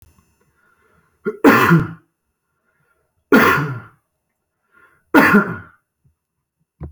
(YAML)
three_cough_length: 6.9 s
three_cough_amplitude: 29734
three_cough_signal_mean_std_ratio: 0.35
survey_phase: beta (2021-08-13 to 2022-03-07)
age: 18-44
gender: Male
wearing_mask: 'No'
symptom_none: true
smoker_status: Never smoked
respiratory_condition_asthma: false
respiratory_condition_other: false
recruitment_source: REACT
submission_delay: 3 days
covid_test_result: Negative
covid_test_method: RT-qPCR